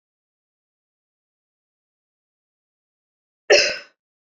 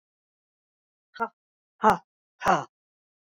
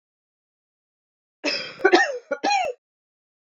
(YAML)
cough_length: 4.4 s
cough_amplitude: 27938
cough_signal_mean_std_ratio: 0.17
exhalation_length: 3.2 s
exhalation_amplitude: 16318
exhalation_signal_mean_std_ratio: 0.24
three_cough_length: 3.6 s
three_cough_amplitude: 25804
three_cough_signal_mean_std_ratio: 0.36
survey_phase: beta (2021-08-13 to 2022-03-07)
age: 45-64
gender: Female
wearing_mask: 'No'
symptom_cough_any: true
symptom_runny_or_blocked_nose: true
symptom_sore_throat: true
smoker_status: Never smoked
respiratory_condition_asthma: false
respiratory_condition_other: false
recruitment_source: Test and Trace
submission_delay: 2 days
covid_test_result: Positive
covid_test_method: LFT